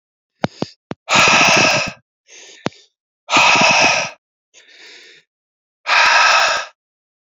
{"exhalation_length": "7.3 s", "exhalation_amplitude": 32767, "exhalation_signal_mean_std_ratio": 0.51, "survey_phase": "beta (2021-08-13 to 2022-03-07)", "age": "18-44", "gender": "Male", "wearing_mask": "No", "symptom_none": true, "smoker_status": "Ex-smoker", "respiratory_condition_asthma": true, "respiratory_condition_other": false, "recruitment_source": "REACT", "submission_delay": "2 days", "covid_test_result": "Negative", "covid_test_method": "RT-qPCR"}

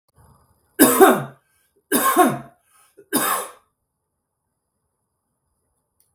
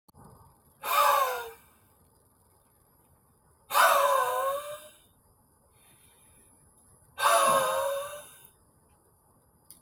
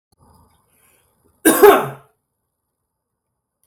{"three_cough_length": "6.1 s", "three_cough_amplitude": 32768, "three_cough_signal_mean_std_ratio": 0.32, "exhalation_length": "9.8 s", "exhalation_amplitude": 12179, "exhalation_signal_mean_std_ratio": 0.42, "cough_length": "3.7 s", "cough_amplitude": 32766, "cough_signal_mean_std_ratio": 0.25, "survey_phase": "beta (2021-08-13 to 2022-03-07)", "age": "18-44", "gender": "Male", "wearing_mask": "No", "symptom_none": true, "smoker_status": "Ex-smoker", "respiratory_condition_asthma": true, "respiratory_condition_other": false, "recruitment_source": "REACT", "submission_delay": "0 days", "covid_test_result": "Negative", "covid_test_method": "RT-qPCR", "influenza_a_test_result": "Negative", "influenza_b_test_result": "Negative"}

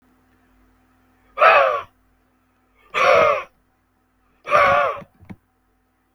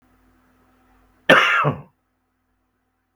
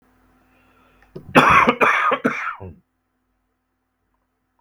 {"exhalation_length": "6.1 s", "exhalation_amplitude": 32768, "exhalation_signal_mean_std_ratio": 0.38, "cough_length": "3.2 s", "cough_amplitude": 32768, "cough_signal_mean_std_ratio": 0.29, "three_cough_length": "4.6 s", "three_cough_amplitude": 32768, "three_cough_signal_mean_std_ratio": 0.37, "survey_phase": "beta (2021-08-13 to 2022-03-07)", "age": "18-44", "gender": "Male", "wearing_mask": "No", "symptom_none": true, "smoker_status": "Current smoker (1 to 10 cigarettes per day)", "respiratory_condition_asthma": false, "respiratory_condition_other": false, "recruitment_source": "REACT", "submission_delay": "7 days", "covid_test_result": "Negative", "covid_test_method": "RT-qPCR", "influenza_a_test_result": "Negative", "influenza_b_test_result": "Negative"}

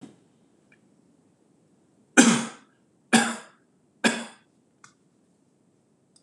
{"three_cough_length": "6.2 s", "three_cough_amplitude": 26028, "three_cough_signal_mean_std_ratio": 0.24, "survey_phase": "beta (2021-08-13 to 2022-03-07)", "age": "45-64", "gender": "Male", "wearing_mask": "No", "symptom_sore_throat": true, "smoker_status": "Never smoked", "respiratory_condition_asthma": false, "respiratory_condition_other": false, "recruitment_source": "REACT", "submission_delay": "8 days", "covid_test_result": "Negative", "covid_test_method": "RT-qPCR", "influenza_a_test_result": "Negative", "influenza_b_test_result": "Negative"}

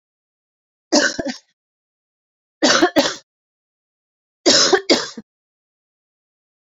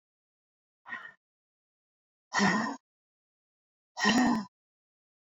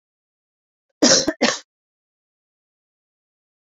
{"three_cough_length": "6.7 s", "three_cough_amplitude": 31687, "three_cough_signal_mean_std_ratio": 0.33, "exhalation_length": "5.4 s", "exhalation_amplitude": 7803, "exhalation_signal_mean_std_ratio": 0.34, "cough_length": "3.8 s", "cough_amplitude": 32767, "cough_signal_mean_std_ratio": 0.25, "survey_phase": "beta (2021-08-13 to 2022-03-07)", "age": "18-44", "gender": "Female", "wearing_mask": "No", "symptom_cough_any": true, "symptom_runny_or_blocked_nose": true, "symptom_headache": true, "symptom_change_to_sense_of_smell_or_taste": true, "symptom_loss_of_taste": true, "symptom_onset": "5 days", "smoker_status": "Ex-smoker", "respiratory_condition_asthma": false, "respiratory_condition_other": false, "recruitment_source": "Test and Trace", "submission_delay": "2 days", "covid_test_result": "Positive", "covid_test_method": "RT-qPCR", "covid_ct_value": 21.2, "covid_ct_gene": "N gene"}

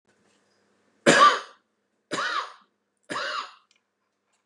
{"three_cough_length": "4.5 s", "three_cough_amplitude": 25884, "three_cough_signal_mean_std_ratio": 0.31, "survey_phase": "beta (2021-08-13 to 2022-03-07)", "age": "65+", "gender": "Male", "wearing_mask": "No", "symptom_none": true, "symptom_onset": "6 days", "smoker_status": "Ex-smoker", "respiratory_condition_asthma": false, "respiratory_condition_other": false, "recruitment_source": "REACT", "submission_delay": "6 days", "covid_test_result": "Negative", "covid_test_method": "RT-qPCR", "influenza_a_test_result": "Negative", "influenza_b_test_result": "Negative"}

